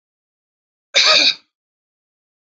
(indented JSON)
{
  "cough_length": "2.6 s",
  "cough_amplitude": 28521,
  "cough_signal_mean_std_ratio": 0.32,
  "survey_phase": "beta (2021-08-13 to 2022-03-07)",
  "age": "45-64",
  "gender": "Male",
  "wearing_mask": "No",
  "symptom_none": true,
  "smoker_status": "Never smoked",
  "respiratory_condition_asthma": false,
  "respiratory_condition_other": false,
  "recruitment_source": "REACT",
  "submission_delay": "2 days",
  "covid_test_result": "Negative",
  "covid_test_method": "RT-qPCR",
  "influenza_a_test_result": "Unknown/Void",
  "influenza_b_test_result": "Unknown/Void"
}